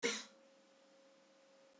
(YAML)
cough_length: 1.8 s
cough_amplitude: 2508
cough_signal_mean_std_ratio: 0.33
survey_phase: beta (2021-08-13 to 2022-03-07)
age: 45-64
gender: Female
wearing_mask: 'No'
symptom_cough_any: true
symptom_runny_or_blocked_nose: true
symptom_onset: 6 days
smoker_status: Never smoked
respiratory_condition_asthma: false
respiratory_condition_other: false
recruitment_source: Test and Trace
submission_delay: 2 days
covid_test_result: Positive
covid_test_method: ePCR